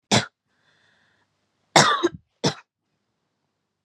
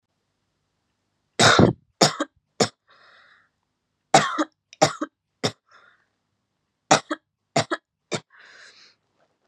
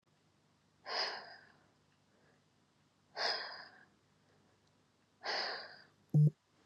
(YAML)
cough_length: 3.8 s
cough_amplitude: 32768
cough_signal_mean_std_ratio: 0.27
three_cough_length: 9.5 s
three_cough_amplitude: 32767
three_cough_signal_mean_std_ratio: 0.27
exhalation_length: 6.7 s
exhalation_amplitude: 3160
exhalation_signal_mean_std_ratio: 0.31
survey_phase: beta (2021-08-13 to 2022-03-07)
age: 18-44
gender: Female
wearing_mask: 'No'
symptom_abdominal_pain: true
symptom_diarrhoea: true
symptom_fatigue: true
symptom_headache: true
smoker_status: Current smoker (1 to 10 cigarettes per day)
respiratory_condition_asthma: false
respiratory_condition_other: false
recruitment_source: REACT
submission_delay: 2 days
covid_test_result: Negative
covid_test_method: RT-qPCR
influenza_a_test_result: Negative
influenza_b_test_result: Negative